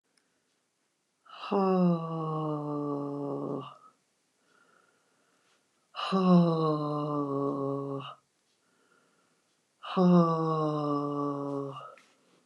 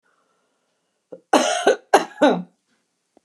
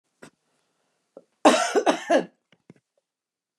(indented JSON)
{
  "exhalation_length": "12.5 s",
  "exhalation_amplitude": 8228,
  "exhalation_signal_mean_std_ratio": 0.54,
  "three_cough_length": "3.2 s",
  "three_cough_amplitude": 29203,
  "three_cough_signal_mean_std_ratio": 0.34,
  "cough_length": "3.6 s",
  "cough_amplitude": 24895,
  "cough_signal_mean_std_ratio": 0.31,
  "survey_phase": "beta (2021-08-13 to 2022-03-07)",
  "age": "65+",
  "gender": "Female",
  "wearing_mask": "No",
  "symptom_runny_or_blocked_nose": true,
  "symptom_sore_throat": true,
  "symptom_fatigue": true,
  "symptom_headache": true,
  "smoker_status": "Never smoked",
  "respiratory_condition_asthma": false,
  "respiratory_condition_other": false,
  "recruitment_source": "REACT",
  "submission_delay": "2 days",
  "covid_test_result": "Negative",
  "covid_test_method": "RT-qPCR"
}